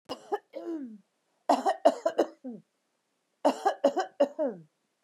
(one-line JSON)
{"three_cough_length": "5.0 s", "three_cough_amplitude": 12166, "three_cough_signal_mean_std_ratio": 0.4, "survey_phase": "beta (2021-08-13 to 2022-03-07)", "age": "45-64", "gender": "Female", "wearing_mask": "No", "symptom_none": true, "smoker_status": "Never smoked", "respiratory_condition_asthma": true, "respiratory_condition_other": false, "recruitment_source": "REACT", "submission_delay": "3 days", "covid_test_result": "Negative", "covid_test_method": "RT-qPCR", "influenza_a_test_result": "Negative", "influenza_b_test_result": "Negative"}